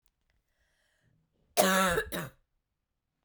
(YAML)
cough_length: 3.2 s
cough_amplitude: 11952
cough_signal_mean_std_ratio: 0.33
survey_phase: beta (2021-08-13 to 2022-03-07)
age: 18-44
gender: Female
wearing_mask: 'No'
symptom_cough_any: true
symptom_runny_or_blocked_nose: true
symptom_shortness_of_breath: true
symptom_sore_throat: true
symptom_diarrhoea: true
symptom_fatigue: true
symptom_fever_high_temperature: true
symptom_headache: true
symptom_change_to_sense_of_smell_or_taste: true
symptom_loss_of_taste: true
symptom_other: true
symptom_onset: 2 days
smoker_status: Never smoked
respiratory_condition_asthma: true
respiratory_condition_other: false
recruitment_source: Test and Trace
submission_delay: 2 days
covid_test_result: Positive
covid_test_method: RT-qPCR
covid_ct_value: 24.7
covid_ct_gene: S gene
covid_ct_mean: 25.2
covid_viral_load: 5500 copies/ml
covid_viral_load_category: Minimal viral load (< 10K copies/ml)